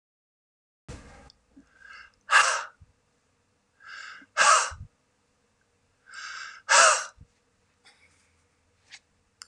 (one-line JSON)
{"exhalation_length": "9.5 s", "exhalation_amplitude": 18986, "exhalation_signal_mean_std_ratio": 0.28, "survey_phase": "alpha (2021-03-01 to 2021-08-12)", "age": "45-64", "gender": "Male", "wearing_mask": "No", "symptom_cough_any": true, "symptom_onset": "8 days", "smoker_status": "Never smoked", "respiratory_condition_asthma": true, "respiratory_condition_other": false, "recruitment_source": "REACT", "submission_delay": "2 days", "covid_test_result": "Negative", "covid_test_method": "RT-qPCR"}